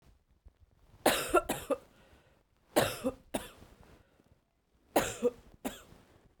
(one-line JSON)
{"three_cough_length": "6.4 s", "three_cough_amplitude": 10337, "three_cough_signal_mean_std_ratio": 0.33, "survey_phase": "beta (2021-08-13 to 2022-03-07)", "age": "18-44", "gender": "Female", "wearing_mask": "No", "symptom_runny_or_blocked_nose": true, "symptom_fatigue": true, "symptom_headache": true, "symptom_onset": "1 day", "smoker_status": "Never smoked", "respiratory_condition_asthma": false, "respiratory_condition_other": false, "recruitment_source": "Test and Trace", "submission_delay": "1 day", "covid_test_result": "Positive", "covid_test_method": "LAMP"}